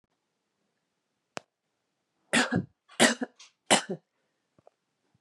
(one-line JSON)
{"three_cough_length": "5.2 s", "three_cough_amplitude": 15495, "three_cough_signal_mean_std_ratio": 0.25, "survey_phase": "beta (2021-08-13 to 2022-03-07)", "age": "45-64", "gender": "Female", "wearing_mask": "No", "symptom_cough_any": true, "symptom_runny_or_blocked_nose": true, "smoker_status": "Ex-smoker", "respiratory_condition_asthma": false, "respiratory_condition_other": false, "recruitment_source": "Test and Trace", "submission_delay": "2 days", "covid_test_result": "Positive", "covid_test_method": "RT-qPCR", "covid_ct_value": 20.8, "covid_ct_gene": "N gene"}